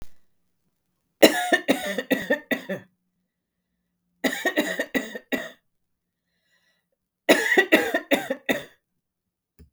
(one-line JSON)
{"three_cough_length": "9.7 s", "three_cough_amplitude": 32768, "three_cough_signal_mean_std_ratio": 0.36, "survey_phase": "beta (2021-08-13 to 2022-03-07)", "age": "45-64", "gender": "Female", "wearing_mask": "No", "symptom_none": true, "smoker_status": "Ex-smoker", "respiratory_condition_asthma": true, "respiratory_condition_other": false, "recruitment_source": "REACT", "submission_delay": "3 days", "covid_test_result": "Negative", "covid_test_method": "RT-qPCR", "influenza_a_test_result": "Negative", "influenza_b_test_result": "Negative"}